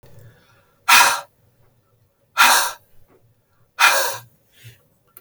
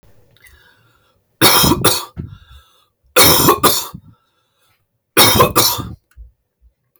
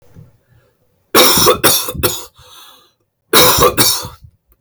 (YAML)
exhalation_length: 5.2 s
exhalation_amplitude: 32768
exhalation_signal_mean_std_ratio: 0.35
three_cough_length: 7.0 s
three_cough_amplitude: 32768
three_cough_signal_mean_std_ratio: 0.43
cough_length: 4.6 s
cough_amplitude: 32768
cough_signal_mean_std_ratio: 0.49
survey_phase: beta (2021-08-13 to 2022-03-07)
age: 45-64
gender: Female
wearing_mask: 'No'
symptom_fatigue: true
symptom_headache: true
smoker_status: Never smoked
respiratory_condition_asthma: false
respiratory_condition_other: false
recruitment_source: REACT
submission_delay: 4 days
covid_test_result: Negative
covid_test_method: RT-qPCR